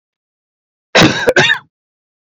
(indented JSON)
{
  "cough_length": "2.4 s",
  "cough_amplitude": 32767,
  "cough_signal_mean_std_ratio": 0.39,
  "survey_phase": "beta (2021-08-13 to 2022-03-07)",
  "age": "45-64",
  "gender": "Male",
  "wearing_mask": "No",
  "symptom_cough_any": true,
  "symptom_runny_or_blocked_nose": true,
  "symptom_fatigue": true,
  "symptom_fever_high_temperature": true,
  "symptom_headache": true,
  "smoker_status": "Never smoked",
  "respiratory_condition_asthma": false,
  "respiratory_condition_other": false,
  "recruitment_source": "Test and Trace",
  "submission_delay": "1 day",
  "covid_test_result": "Positive",
  "covid_test_method": "RT-qPCR",
  "covid_ct_value": 22.8,
  "covid_ct_gene": "ORF1ab gene",
  "covid_ct_mean": 23.4,
  "covid_viral_load": "21000 copies/ml",
  "covid_viral_load_category": "Low viral load (10K-1M copies/ml)"
}